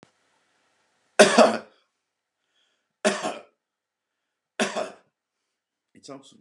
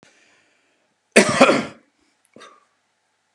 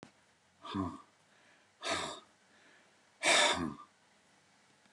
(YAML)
three_cough_length: 6.4 s
three_cough_amplitude: 32240
three_cough_signal_mean_std_ratio: 0.24
cough_length: 3.3 s
cough_amplitude: 32768
cough_signal_mean_std_ratio: 0.27
exhalation_length: 4.9 s
exhalation_amplitude: 6071
exhalation_signal_mean_std_ratio: 0.36
survey_phase: beta (2021-08-13 to 2022-03-07)
age: 65+
gender: Male
wearing_mask: 'No'
symptom_none: true
smoker_status: Ex-smoker
respiratory_condition_asthma: false
respiratory_condition_other: false
recruitment_source: REACT
submission_delay: 3 days
covid_test_result: Negative
covid_test_method: RT-qPCR